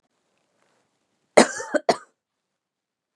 {"cough_length": "3.2 s", "cough_amplitude": 32697, "cough_signal_mean_std_ratio": 0.19, "survey_phase": "beta (2021-08-13 to 2022-03-07)", "age": "45-64", "gender": "Female", "wearing_mask": "No", "symptom_cough_any": true, "symptom_runny_or_blocked_nose": true, "symptom_sore_throat": true, "symptom_abdominal_pain": true, "symptom_fatigue": true, "symptom_headache": true, "smoker_status": "Never smoked", "respiratory_condition_asthma": false, "respiratory_condition_other": false, "recruitment_source": "Test and Trace", "submission_delay": "1 day", "covid_test_result": "Positive", "covid_test_method": "ePCR"}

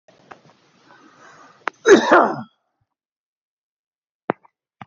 {"cough_length": "4.9 s", "cough_amplitude": 28900, "cough_signal_mean_std_ratio": 0.24, "survey_phase": "beta (2021-08-13 to 2022-03-07)", "age": "65+", "gender": "Male", "wearing_mask": "No", "symptom_none": true, "smoker_status": "Ex-smoker", "respiratory_condition_asthma": false, "respiratory_condition_other": false, "recruitment_source": "REACT", "submission_delay": "2 days", "covid_test_result": "Negative", "covid_test_method": "RT-qPCR", "influenza_a_test_result": "Negative", "influenza_b_test_result": "Negative"}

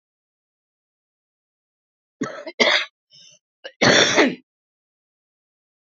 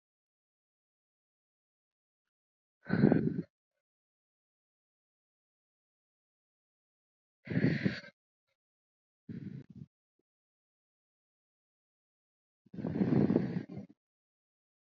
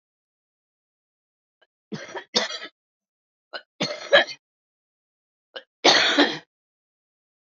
{"cough_length": "6.0 s", "cough_amplitude": 29495, "cough_signal_mean_std_ratio": 0.3, "exhalation_length": "14.8 s", "exhalation_amplitude": 8705, "exhalation_signal_mean_std_ratio": 0.26, "three_cough_length": "7.4 s", "three_cough_amplitude": 26644, "three_cough_signal_mean_std_ratio": 0.28, "survey_phase": "alpha (2021-03-01 to 2021-08-12)", "age": "45-64", "gender": "Female", "wearing_mask": "No", "symptom_none": true, "symptom_onset": "13 days", "smoker_status": "Current smoker (11 or more cigarettes per day)", "respiratory_condition_asthma": false, "respiratory_condition_other": false, "recruitment_source": "REACT", "submission_delay": "2 days", "covid_test_result": "Negative", "covid_test_method": "RT-qPCR"}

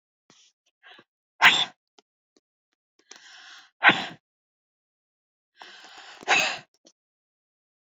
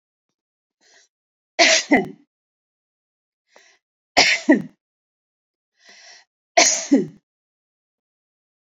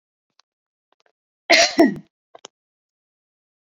{"exhalation_length": "7.9 s", "exhalation_amplitude": 27405, "exhalation_signal_mean_std_ratio": 0.23, "three_cough_length": "8.8 s", "three_cough_amplitude": 31195, "three_cough_signal_mean_std_ratio": 0.28, "cough_length": "3.8 s", "cough_amplitude": 30792, "cough_signal_mean_std_ratio": 0.24, "survey_phase": "beta (2021-08-13 to 2022-03-07)", "age": "45-64", "gender": "Female", "wearing_mask": "No", "symptom_none": true, "smoker_status": "Ex-smoker", "respiratory_condition_asthma": false, "respiratory_condition_other": false, "recruitment_source": "REACT", "submission_delay": "1 day", "covid_test_result": "Negative", "covid_test_method": "RT-qPCR"}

